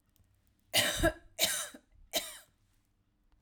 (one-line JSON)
{"cough_length": "3.4 s", "cough_amplitude": 7477, "cough_signal_mean_std_ratio": 0.38, "survey_phase": "alpha (2021-03-01 to 2021-08-12)", "age": "18-44", "gender": "Female", "wearing_mask": "No", "symptom_fatigue": true, "smoker_status": "Prefer not to say", "respiratory_condition_asthma": false, "respiratory_condition_other": false, "recruitment_source": "REACT", "submission_delay": "2 days", "covid_test_result": "Negative", "covid_test_method": "RT-qPCR"}